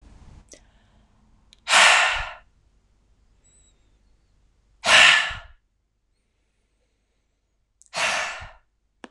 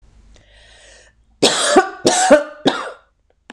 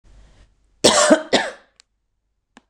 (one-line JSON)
{"exhalation_length": "9.1 s", "exhalation_amplitude": 26028, "exhalation_signal_mean_std_ratio": 0.3, "three_cough_length": "3.5 s", "three_cough_amplitude": 26028, "three_cough_signal_mean_std_ratio": 0.43, "cough_length": "2.7 s", "cough_amplitude": 26028, "cough_signal_mean_std_ratio": 0.34, "survey_phase": "beta (2021-08-13 to 2022-03-07)", "age": "45-64", "gender": "Female", "wearing_mask": "No", "symptom_none": true, "smoker_status": "Never smoked", "respiratory_condition_asthma": false, "respiratory_condition_other": false, "recruitment_source": "REACT", "submission_delay": "1 day", "covid_test_result": "Negative", "covid_test_method": "RT-qPCR", "influenza_a_test_result": "Unknown/Void", "influenza_b_test_result": "Unknown/Void"}